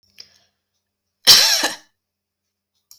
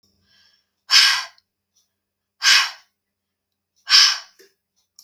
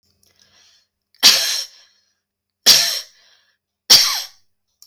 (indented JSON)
{
  "cough_length": "3.0 s",
  "cough_amplitude": 32768,
  "cough_signal_mean_std_ratio": 0.28,
  "exhalation_length": "5.0 s",
  "exhalation_amplitude": 32768,
  "exhalation_signal_mean_std_ratio": 0.32,
  "three_cough_length": "4.9 s",
  "three_cough_amplitude": 32768,
  "three_cough_signal_mean_std_ratio": 0.33,
  "survey_phase": "beta (2021-08-13 to 2022-03-07)",
  "age": "45-64",
  "gender": "Female",
  "wearing_mask": "No",
  "symptom_headache": true,
  "smoker_status": "Never smoked",
  "respiratory_condition_asthma": false,
  "respiratory_condition_other": false,
  "recruitment_source": "REACT",
  "submission_delay": "3 days",
  "covid_test_result": "Negative",
  "covid_test_method": "RT-qPCR",
  "influenza_a_test_result": "Negative",
  "influenza_b_test_result": "Negative"
}